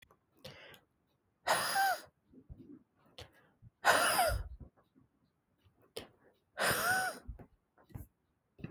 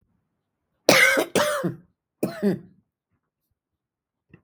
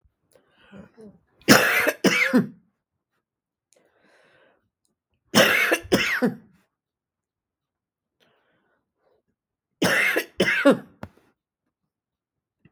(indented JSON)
{
  "exhalation_length": "8.7 s",
  "exhalation_amplitude": 7857,
  "exhalation_signal_mean_std_ratio": 0.4,
  "cough_length": "4.4 s",
  "cough_amplitude": 32768,
  "cough_signal_mean_std_ratio": 0.35,
  "three_cough_length": "12.7 s",
  "three_cough_amplitude": 32766,
  "three_cough_signal_mean_std_ratio": 0.34,
  "survey_phase": "beta (2021-08-13 to 2022-03-07)",
  "age": "45-64",
  "gender": "Female",
  "wearing_mask": "No",
  "symptom_none": true,
  "smoker_status": "Ex-smoker",
  "respiratory_condition_asthma": false,
  "respiratory_condition_other": false,
  "recruitment_source": "REACT",
  "submission_delay": "1 day",
  "covid_test_result": "Negative",
  "covid_test_method": "RT-qPCR"
}